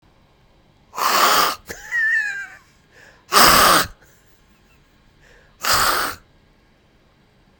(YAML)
exhalation_length: 7.6 s
exhalation_amplitude: 32768
exhalation_signal_mean_std_ratio: 0.43
survey_phase: beta (2021-08-13 to 2022-03-07)
age: 45-64
gender: Male
wearing_mask: 'No'
symptom_none: true
symptom_onset: 13 days
smoker_status: Ex-smoker
respiratory_condition_asthma: false
respiratory_condition_other: false
recruitment_source: REACT
submission_delay: 1 day
covid_test_result: Negative
covid_test_method: RT-qPCR